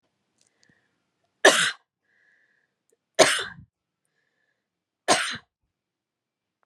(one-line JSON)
{"three_cough_length": "6.7 s", "three_cough_amplitude": 30343, "three_cough_signal_mean_std_ratio": 0.23, "survey_phase": "beta (2021-08-13 to 2022-03-07)", "age": "45-64", "gender": "Female", "wearing_mask": "No", "symptom_none": true, "symptom_onset": "5 days", "smoker_status": "Ex-smoker", "respiratory_condition_asthma": false, "respiratory_condition_other": false, "recruitment_source": "REACT", "submission_delay": "1 day", "covid_test_result": "Negative", "covid_test_method": "RT-qPCR", "influenza_a_test_result": "Negative", "influenza_b_test_result": "Negative"}